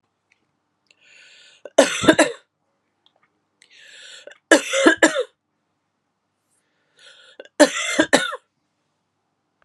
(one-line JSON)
{"three_cough_length": "9.6 s", "three_cough_amplitude": 32767, "three_cough_signal_mean_std_ratio": 0.28, "survey_phase": "beta (2021-08-13 to 2022-03-07)", "age": "45-64", "gender": "Female", "wearing_mask": "No", "symptom_cough_any": true, "symptom_runny_or_blocked_nose": true, "symptom_loss_of_taste": true, "smoker_status": "Ex-smoker", "respiratory_condition_asthma": false, "respiratory_condition_other": false, "recruitment_source": "Test and Trace", "submission_delay": "1 day", "covid_test_result": "Positive", "covid_test_method": "RT-qPCR"}